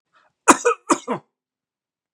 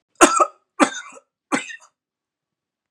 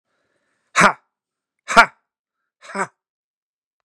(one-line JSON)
{"cough_length": "2.1 s", "cough_amplitude": 32768, "cough_signal_mean_std_ratio": 0.27, "three_cough_length": "2.9 s", "three_cough_amplitude": 32768, "three_cough_signal_mean_std_ratio": 0.29, "exhalation_length": "3.8 s", "exhalation_amplitude": 32768, "exhalation_signal_mean_std_ratio": 0.21, "survey_phase": "beta (2021-08-13 to 2022-03-07)", "age": "18-44", "gender": "Male", "wearing_mask": "No", "symptom_none": true, "smoker_status": "Never smoked", "respiratory_condition_asthma": false, "respiratory_condition_other": false, "recruitment_source": "REACT", "submission_delay": "2 days", "covid_test_result": "Negative", "covid_test_method": "RT-qPCR", "influenza_a_test_result": "Negative", "influenza_b_test_result": "Negative"}